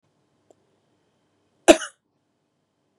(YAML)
cough_length: 3.0 s
cough_amplitude: 32767
cough_signal_mean_std_ratio: 0.12
survey_phase: beta (2021-08-13 to 2022-03-07)
age: 18-44
gender: Female
wearing_mask: 'No'
symptom_none: true
symptom_onset: 12 days
smoker_status: Never smoked
respiratory_condition_asthma: false
respiratory_condition_other: false
recruitment_source: REACT
submission_delay: 1 day
covid_test_result: Negative
covid_test_method: RT-qPCR
influenza_a_test_result: Negative
influenza_b_test_result: Negative